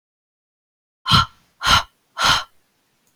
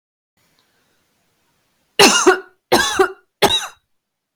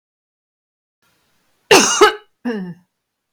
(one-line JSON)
{"exhalation_length": "3.2 s", "exhalation_amplitude": 31631, "exhalation_signal_mean_std_ratio": 0.35, "three_cough_length": "4.4 s", "three_cough_amplitude": 32766, "three_cough_signal_mean_std_ratio": 0.35, "cough_length": "3.3 s", "cough_amplitude": 32767, "cough_signal_mean_std_ratio": 0.31, "survey_phase": "beta (2021-08-13 to 2022-03-07)", "age": "45-64", "gender": "Female", "wearing_mask": "No", "symptom_none": true, "smoker_status": "Never smoked", "respiratory_condition_asthma": false, "respiratory_condition_other": false, "recruitment_source": "REACT", "submission_delay": "2 days", "covid_test_result": "Negative", "covid_test_method": "RT-qPCR", "influenza_a_test_result": "Negative", "influenza_b_test_result": "Negative"}